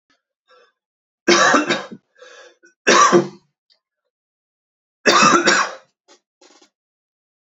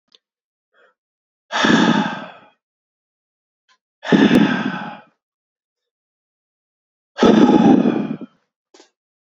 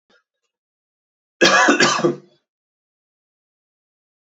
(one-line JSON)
{"three_cough_length": "7.6 s", "three_cough_amplitude": 29728, "three_cough_signal_mean_std_ratio": 0.37, "exhalation_length": "9.2 s", "exhalation_amplitude": 32739, "exhalation_signal_mean_std_ratio": 0.39, "cough_length": "4.4 s", "cough_amplitude": 32767, "cough_signal_mean_std_ratio": 0.32, "survey_phase": "alpha (2021-03-01 to 2021-08-12)", "age": "18-44", "gender": "Male", "wearing_mask": "No", "symptom_cough_any": true, "symptom_fatigue": true, "symptom_headache": true, "symptom_onset": "3 days", "smoker_status": "Never smoked", "respiratory_condition_asthma": true, "respiratory_condition_other": false, "recruitment_source": "Test and Trace", "submission_delay": "2 days", "covid_test_result": "Positive", "covid_test_method": "RT-qPCR", "covid_ct_value": 28.8, "covid_ct_gene": "N gene"}